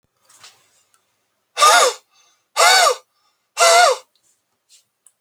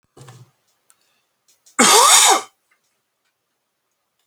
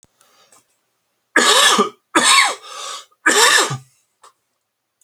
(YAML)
exhalation_length: 5.2 s
exhalation_amplitude: 32768
exhalation_signal_mean_std_ratio: 0.39
cough_length: 4.3 s
cough_amplitude: 32768
cough_signal_mean_std_ratio: 0.32
three_cough_length: 5.0 s
three_cough_amplitude: 32768
three_cough_signal_mean_std_ratio: 0.46
survey_phase: beta (2021-08-13 to 2022-03-07)
age: 18-44
gender: Male
wearing_mask: 'No'
symptom_cough_any: true
symptom_sore_throat: true
symptom_headache: true
symptom_onset: 7 days
smoker_status: Ex-smoker
respiratory_condition_asthma: false
respiratory_condition_other: false
recruitment_source: REACT
submission_delay: 1 day
covid_test_result: Positive
covid_test_method: RT-qPCR
covid_ct_value: 31.0
covid_ct_gene: E gene